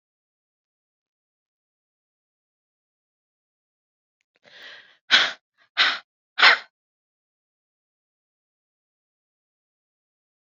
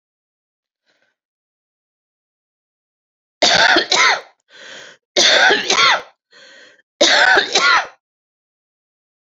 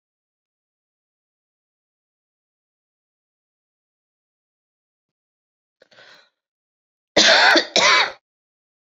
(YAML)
exhalation_length: 10.4 s
exhalation_amplitude: 32671
exhalation_signal_mean_std_ratio: 0.17
three_cough_length: 9.4 s
three_cough_amplitude: 32767
three_cough_signal_mean_std_ratio: 0.41
cough_length: 8.9 s
cough_amplitude: 29081
cough_signal_mean_std_ratio: 0.24
survey_phase: beta (2021-08-13 to 2022-03-07)
age: 45-64
gender: Female
wearing_mask: 'No'
symptom_cough_any: true
symptom_new_continuous_cough: true
symptom_runny_or_blocked_nose: true
symptom_shortness_of_breath: true
symptom_fatigue: true
symptom_headache: true
symptom_other: true
symptom_onset: 3 days
smoker_status: Current smoker (11 or more cigarettes per day)
respiratory_condition_asthma: true
respiratory_condition_other: false
recruitment_source: Test and Trace
submission_delay: 3 days
covid_test_result: Positive
covid_test_method: RT-qPCR
covid_ct_value: 17.1
covid_ct_gene: ORF1ab gene
covid_ct_mean: 17.5
covid_viral_load: 1800000 copies/ml
covid_viral_load_category: High viral load (>1M copies/ml)